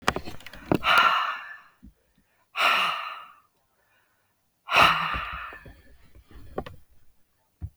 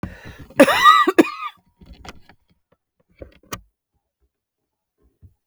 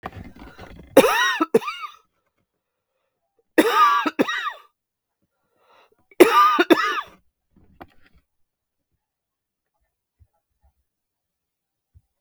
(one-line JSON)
{"exhalation_length": "7.8 s", "exhalation_amplitude": 20764, "exhalation_signal_mean_std_ratio": 0.42, "cough_length": "5.5 s", "cough_amplitude": 32768, "cough_signal_mean_std_ratio": 0.27, "three_cough_length": "12.2 s", "three_cough_amplitude": 32768, "three_cough_signal_mean_std_ratio": 0.31, "survey_phase": "beta (2021-08-13 to 2022-03-07)", "age": "45-64", "gender": "Female", "wearing_mask": "No", "symptom_cough_any": true, "symptom_new_continuous_cough": true, "symptom_runny_or_blocked_nose": true, "symptom_fatigue": true, "symptom_headache": true, "symptom_change_to_sense_of_smell_or_taste": true, "symptom_loss_of_taste": true, "symptom_onset": "3 days", "smoker_status": "Never smoked", "respiratory_condition_asthma": false, "respiratory_condition_other": false, "recruitment_source": "Test and Trace", "submission_delay": "2 days", "covid_test_result": "Positive", "covid_test_method": "ePCR"}